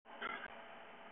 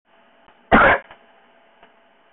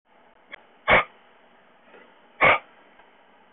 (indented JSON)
{
  "cough_length": "1.1 s",
  "cough_amplitude": 847,
  "cough_signal_mean_std_ratio": 0.81,
  "three_cough_length": "2.3 s",
  "three_cough_amplitude": 30433,
  "three_cough_signal_mean_std_ratio": 0.3,
  "exhalation_length": "3.5 s",
  "exhalation_amplitude": 18903,
  "exhalation_signal_mean_std_ratio": 0.27,
  "survey_phase": "beta (2021-08-13 to 2022-03-07)",
  "age": "45-64",
  "gender": "Male",
  "wearing_mask": "No",
  "symptom_fatigue": true,
  "symptom_onset": "12 days",
  "smoker_status": "Ex-smoker",
  "respiratory_condition_asthma": true,
  "respiratory_condition_other": false,
  "recruitment_source": "REACT",
  "submission_delay": "7 days",
  "covid_test_result": "Negative",
  "covid_test_method": "RT-qPCR",
  "influenza_a_test_result": "Negative",
  "influenza_b_test_result": "Negative"
}